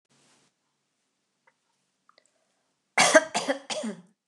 {"three_cough_length": "4.3 s", "three_cough_amplitude": 27023, "three_cough_signal_mean_std_ratio": 0.25, "survey_phase": "beta (2021-08-13 to 2022-03-07)", "age": "65+", "gender": "Female", "wearing_mask": "No", "symptom_runny_or_blocked_nose": true, "symptom_headache": true, "smoker_status": "Never smoked", "respiratory_condition_asthma": false, "respiratory_condition_other": false, "recruitment_source": "Test and Trace", "submission_delay": "2 days", "covid_test_result": "Positive", "covid_test_method": "RT-qPCR"}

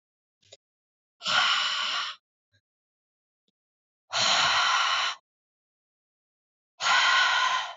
{"exhalation_length": "7.8 s", "exhalation_amplitude": 9774, "exhalation_signal_mean_std_ratio": 0.51, "survey_phase": "alpha (2021-03-01 to 2021-08-12)", "age": "18-44", "gender": "Female", "wearing_mask": "No", "symptom_none": true, "smoker_status": "Current smoker (1 to 10 cigarettes per day)", "respiratory_condition_asthma": true, "respiratory_condition_other": false, "recruitment_source": "REACT", "submission_delay": "2 days", "covid_test_result": "Negative", "covid_test_method": "RT-qPCR"}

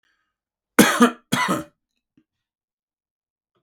{"cough_length": "3.6 s", "cough_amplitude": 32768, "cough_signal_mean_std_ratio": 0.28, "survey_phase": "beta (2021-08-13 to 2022-03-07)", "age": "65+", "gender": "Male", "wearing_mask": "No", "symptom_none": true, "smoker_status": "Never smoked", "respiratory_condition_asthma": false, "respiratory_condition_other": false, "recruitment_source": "REACT", "submission_delay": "1 day", "covid_test_result": "Negative", "covid_test_method": "RT-qPCR", "influenza_a_test_result": "Unknown/Void", "influenza_b_test_result": "Unknown/Void"}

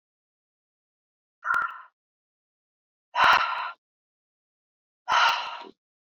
{"exhalation_length": "6.1 s", "exhalation_amplitude": 17358, "exhalation_signal_mean_std_ratio": 0.34, "survey_phase": "beta (2021-08-13 to 2022-03-07)", "age": "18-44", "gender": "Female", "wearing_mask": "No", "symptom_cough_any": true, "smoker_status": "Current smoker (e-cigarettes or vapes only)", "respiratory_condition_asthma": false, "respiratory_condition_other": false, "recruitment_source": "REACT", "submission_delay": "0 days", "covid_test_result": "Negative", "covid_test_method": "RT-qPCR"}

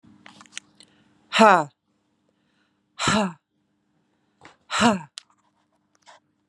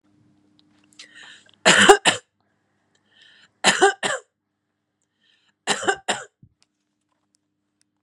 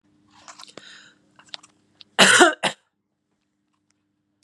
{"exhalation_length": "6.5 s", "exhalation_amplitude": 30817, "exhalation_signal_mean_std_ratio": 0.25, "three_cough_length": "8.0 s", "three_cough_amplitude": 32767, "three_cough_signal_mean_std_ratio": 0.26, "cough_length": "4.4 s", "cough_amplitude": 32767, "cough_signal_mean_std_ratio": 0.24, "survey_phase": "beta (2021-08-13 to 2022-03-07)", "age": "45-64", "gender": "Female", "wearing_mask": "No", "symptom_shortness_of_breath": true, "smoker_status": "Current smoker (1 to 10 cigarettes per day)", "respiratory_condition_asthma": false, "respiratory_condition_other": false, "recruitment_source": "REACT", "submission_delay": "0 days", "covid_test_result": "Negative", "covid_test_method": "RT-qPCR"}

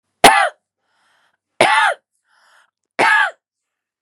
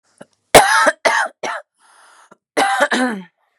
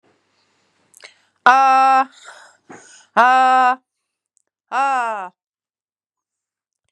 {"three_cough_length": "4.0 s", "three_cough_amplitude": 32768, "three_cough_signal_mean_std_ratio": 0.37, "cough_length": "3.6 s", "cough_amplitude": 32768, "cough_signal_mean_std_ratio": 0.45, "exhalation_length": "6.9 s", "exhalation_amplitude": 32768, "exhalation_signal_mean_std_ratio": 0.39, "survey_phase": "beta (2021-08-13 to 2022-03-07)", "age": "18-44", "gender": "Female", "wearing_mask": "Yes", "symptom_cough_any": true, "symptom_runny_or_blocked_nose": true, "symptom_shortness_of_breath": true, "symptom_abdominal_pain": true, "symptom_fatigue": true, "symptom_loss_of_taste": true, "smoker_status": "Never smoked", "respiratory_condition_asthma": true, "respiratory_condition_other": false, "recruitment_source": "Test and Trace", "submission_delay": "2 days", "covid_test_result": "Positive", "covid_test_method": "RT-qPCR", "covid_ct_value": 28.2, "covid_ct_gene": "ORF1ab gene", "covid_ct_mean": 28.4, "covid_viral_load": "470 copies/ml", "covid_viral_load_category": "Minimal viral load (< 10K copies/ml)"}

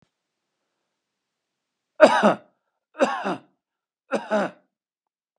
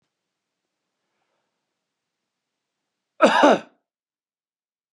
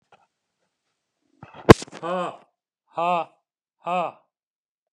{"three_cough_length": "5.4 s", "three_cough_amplitude": 32586, "three_cough_signal_mean_std_ratio": 0.28, "cough_length": "4.9 s", "cough_amplitude": 27955, "cough_signal_mean_std_ratio": 0.21, "exhalation_length": "4.9 s", "exhalation_amplitude": 32768, "exhalation_signal_mean_std_ratio": 0.2, "survey_phase": "beta (2021-08-13 to 2022-03-07)", "age": "65+", "gender": "Male", "wearing_mask": "No", "symptom_none": true, "smoker_status": "Never smoked", "respiratory_condition_asthma": false, "respiratory_condition_other": false, "recruitment_source": "REACT", "submission_delay": "2 days", "covid_test_result": "Negative", "covid_test_method": "RT-qPCR", "influenza_a_test_result": "Negative", "influenza_b_test_result": "Negative"}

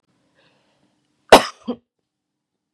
{"cough_length": "2.7 s", "cough_amplitude": 32768, "cough_signal_mean_std_ratio": 0.16, "survey_phase": "beta (2021-08-13 to 2022-03-07)", "age": "45-64", "gender": "Female", "wearing_mask": "No", "symptom_none": true, "smoker_status": "Never smoked", "respiratory_condition_asthma": false, "respiratory_condition_other": false, "recruitment_source": "REACT", "submission_delay": "1 day", "covid_test_result": "Negative", "covid_test_method": "RT-qPCR", "influenza_a_test_result": "Negative", "influenza_b_test_result": "Negative"}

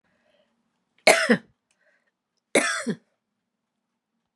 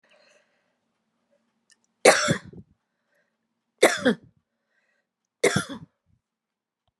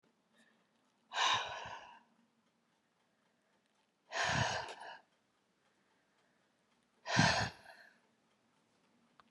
{"cough_length": "4.4 s", "cough_amplitude": 29432, "cough_signal_mean_std_ratio": 0.26, "three_cough_length": "7.0 s", "three_cough_amplitude": 31563, "three_cough_signal_mean_std_ratio": 0.24, "exhalation_length": "9.3 s", "exhalation_amplitude": 5410, "exhalation_signal_mean_std_ratio": 0.33, "survey_phase": "beta (2021-08-13 to 2022-03-07)", "age": "65+", "gender": "Female", "wearing_mask": "No", "symptom_none": true, "smoker_status": "Never smoked", "respiratory_condition_asthma": false, "respiratory_condition_other": false, "recruitment_source": "REACT", "submission_delay": "2 days", "covid_test_result": "Negative", "covid_test_method": "RT-qPCR"}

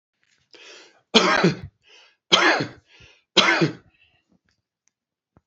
{"three_cough_length": "5.5 s", "three_cough_amplitude": 30192, "three_cough_signal_mean_std_ratio": 0.36, "survey_phase": "beta (2021-08-13 to 2022-03-07)", "age": "45-64", "gender": "Male", "wearing_mask": "No", "symptom_none": true, "smoker_status": "Never smoked", "respiratory_condition_asthma": false, "respiratory_condition_other": false, "recruitment_source": "REACT", "submission_delay": "1 day", "covid_test_result": "Negative", "covid_test_method": "RT-qPCR", "influenza_a_test_result": "Negative", "influenza_b_test_result": "Negative"}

